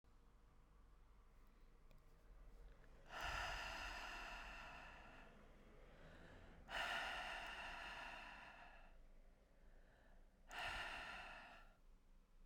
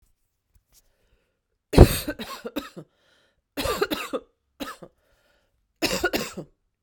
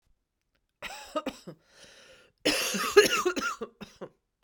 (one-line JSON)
{"exhalation_length": "12.5 s", "exhalation_amplitude": 674, "exhalation_signal_mean_std_ratio": 0.74, "three_cough_length": "6.8 s", "three_cough_amplitude": 32768, "three_cough_signal_mean_std_ratio": 0.25, "cough_length": "4.4 s", "cough_amplitude": 18819, "cough_signal_mean_std_ratio": 0.37, "survey_phase": "beta (2021-08-13 to 2022-03-07)", "age": "18-44", "gender": "Female", "wearing_mask": "No", "symptom_cough_any": true, "symptom_sore_throat": true, "symptom_headache": true, "symptom_other": true, "smoker_status": "Ex-smoker", "respiratory_condition_asthma": false, "respiratory_condition_other": false, "recruitment_source": "Test and Trace", "submission_delay": "2 days", "covid_test_result": "Positive", "covid_test_method": "LFT"}